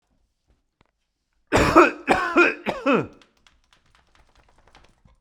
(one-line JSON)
{"three_cough_length": "5.2 s", "three_cough_amplitude": 32767, "three_cough_signal_mean_std_ratio": 0.34, "survey_phase": "beta (2021-08-13 to 2022-03-07)", "age": "18-44", "gender": "Male", "wearing_mask": "No", "symptom_fatigue": true, "symptom_other": true, "smoker_status": "Never smoked", "respiratory_condition_asthma": false, "respiratory_condition_other": false, "recruitment_source": "REACT", "submission_delay": "2 days", "covid_test_result": "Negative", "covid_test_method": "RT-qPCR", "influenza_a_test_result": "Negative", "influenza_b_test_result": "Negative"}